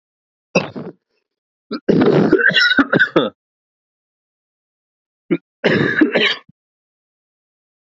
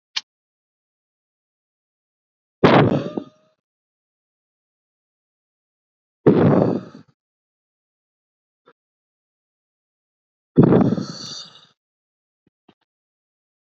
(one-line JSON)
{"cough_length": "7.9 s", "cough_amplitude": 29724, "cough_signal_mean_std_ratio": 0.42, "exhalation_length": "13.7 s", "exhalation_amplitude": 32646, "exhalation_signal_mean_std_ratio": 0.25, "survey_phase": "beta (2021-08-13 to 2022-03-07)", "age": "18-44", "gender": "Male", "wearing_mask": "No", "symptom_none": true, "smoker_status": "Never smoked", "respiratory_condition_asthma": false, "respiratory_condition_other": false, "recruitment_source": "REACT", "submission_delay": "2 days", "covid_test_result": "Negative", "covid_test_method": "RT-qPCR"}